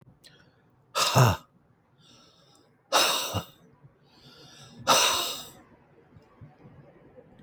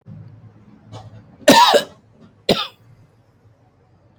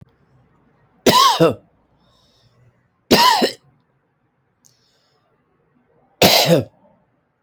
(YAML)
exhalation_length: 7.4 s
exhalation_amplitude: 17726
exhalation_signal_mean_std_ratio: 0.36
cough_length: 4.2 s
cough_amplitude: 31393
cough_signal_mean_std_ratio: 0.3
three_cough_length: 7.4 s
three_cough_amplitude: 31536
three_cough_signal_mean_std_ratio: 0.34
survey_phase: beta (2021-08-13 to 2022-03-07)
age: 45-64
gender: Male
wearing_mask: 'No'
symptom_none: true
smoker_status: Never smoked
respiratory_condition_asthma: true
respiratory_condition_other: false
recruitment_source: REACT
submission_delay: 2 days
covid_test_result: Negative
covid_test_method: RT-qPCR